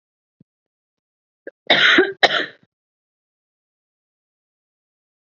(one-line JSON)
{"cough_length": "5.4 s", "cough_amplitude": 32768, "cough_signal_mean_std_ratio": 0.25, "survey_phase": "beta (2021-08-13 to 2022-03-07)", "age": "18-44", "gender": "Female", "wearing_mask": "No", "symptom_cough_any": true, "smoker_status": "Never smoked", "respiratory_condition_asthma": false, "respiratory_condition_other": false, "recruitment_source": "REACT", "submission_delay": "1 day", "covid_test_result": "Negative", "covid_test_method": "RT-qPCR", "influenza_a_test_result": "Negative", "influenza_b_test_result": "Negative"}